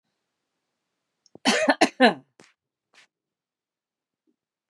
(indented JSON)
{
  "cough_length": "4.7 s",
  "cough_amplitude": 25643,
  "cough_signal_mean_std_ratio": 0.24,
  "survey_phase": "beta (2021-08-13 to 2022-03-07)",
  "age": "45-64",
  "gender": "Female",
  "wearing_mask": "No",
  "symptom_none": true,
  "smoker_status": "Never smoked",
  "respiratory_condition_asthma": true,
  "respiratory_condition_other": false,
  "recruitment_source": "REACT",
  "submission_delay": "2 days",
  "covid_test_result": "Negative",
  "covid_test_method": "RT-qPCR",
  "influenza_a_test_result": "Negative",
  "influenza_b_test_result": "Negative"
}